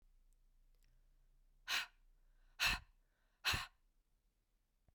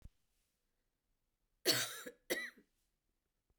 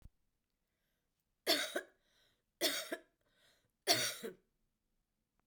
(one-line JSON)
{"exhalation_length": "4.9 s", "exhalation_amplitude": 2130, "exhalation_signal_mean_std_ratio": 0.3, "cough_length": "3.6 s", "cough_amplitude": 3738, "cough_signal_mean_std_ratio": 0.28, "three_cough_length": "5.5 s", "three_cough_amplitude": 4651, "three_cough_signal_mean_std_ratio": 0.31, "survey_phase": "beta (2021-08-13 to 2022-03-07)", "age": "45-64", "gender": "Female", "wearing_mask": "No", "symptom_cough_any": true, "symptom_runny_or_blocked_nose": true, "symptom_shortness_of_breath": true, "symptom_sore_throat": true, "symptom_fatigue": true, "smoker_status": "Never smoked", "respiratory_condition_asthma": false, "respiratory_condition_other": false, "recruitment_source": "Test and Trace", "submission_delay": "1 day", "covid_test_result": "Positive", "covid_test_method": "LFT"}